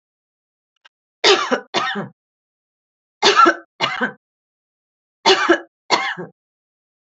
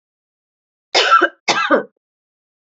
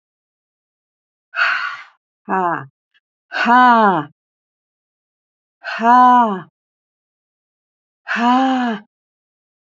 {"three_cough_length": "7.2 s", "three_cough_amplitude": 32767, "three_cough_signal_mean_std_ratio": 0.36, "cough_length": "2.7 s", "cough_amplitude": 30361, "cough_signal_mean_std_ratio": 0.39, "exhalation_length": "9.7 s", "exhalation_amplitude": 28128, "exhalation_signal_mean_std_ratio": 0.4, "survey_phase": "beta (2021-08-13 to 2022-03-07)", "age": "65+", "gender": "Female", "wearing_mask": "No", "symptom_none": true, "smoker_status": "Ex-smoker", "respiratory_condition_asthma": false, "respiratory_condition_other": false, "recruitment_source": "REACT", "submission_delay": "2 days", "covid_test_result": "Negative", "covid_test_method": "RT-qPCR", "influenza_a_test_result": "Negative", "influenza_b_test_result": "Negative"}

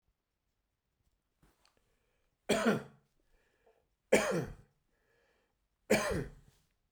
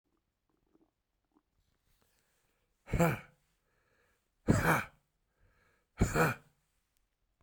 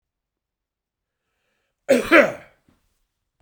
{"three_cough_length": "6.9 s", "three_cough_amplitude": 7228, "three_cough_signal_mean_std_ratio": 0.3, "exhalation_length": "7.4 s", "exhalation_amplitude": 7071, "exhalation_signal_mean_std_ratio": 0.28, "cough_length": "3.4 s", "cough_amplitude": 31167, "cough_signal_mean_std_ratio": 0.24, "survey_phase": "beta (2021-08-13 to 2022-03-07)", "age": "65+", "gender": "Male", "wearing_mask": "No", "symptom_none": true, "smoker_status": "Never smoked", "respiratory_condition_asthma": false, "respiratory_condition_other": false, "recruitment_source": "REACT", "submission_delay": "2 days", "covid_test_result": "Negative", "covid_test_method": "RT-qPCR"}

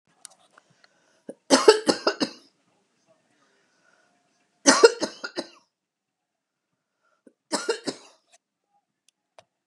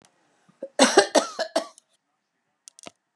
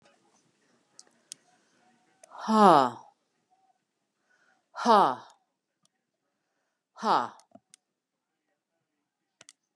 {"three_cough_length": "9.7 s", "three_cough_amplitude": 31556, "three_cough_signal_mean_std_ratio": 0.22, "cough_length": "3.2 s", "cough_amplitude": 30061, "cough_signal_mean_std_ratio": 0.29, "exhalation_length": "9.8 s", "exhalation_amplitude": 19181, "exhalation_signal_mean_std_ratio": 0.22, "survey_phase": "beta (2021-08-13 to 2022-03-07)", "age": "65+", "gender": "Female", "wearing_mask": "No", "symptom_none": true, "smoker_status": "Never smoked", "respiratory_condition_asthma": false, "respiratory_condition_other": false, "recruitment_source": "REACT", "submission_delay": "1 day", "covid_test_result": "Negative", "covid_test_method": "RT-qPCR", "influenza_a_test_result": "Negative", "influenza_b_test_result": "Negative"}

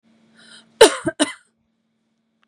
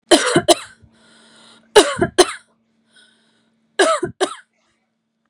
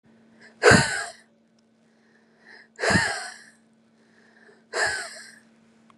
{"cough_length": "2.5 s", "cough_amplitude": 32768, "cough_signal_mean_std_ratio": 0.22, "three_cough_length": "5.3 s", "three_cough_amplitude": 32768, "three_cough_signal_mean_std_ratio": 0.33, "exhalation_length": "6.0 s", "exhalation_amplitude": 28449, "exhalation_signal_mean_std_ratio": 0.32, "survey_phase": "beta (2021-08-13 to 2022-03-07)", "age": "18-44", "gender": "Female", "wearing_mask": "No", "symptom_headache": true, "smoker_status": "Never smoked", "respiratory_condition_asthma": true, "respiratory_condition_other": false, "recruitment_source": "REACT", "submission_delay": "4 days", "covid_test_result": "Negative", "covid_test_method": "RT-qPCR", "influenza_a_test_result": "Negative", "influenza_b_test_result": "Negative"}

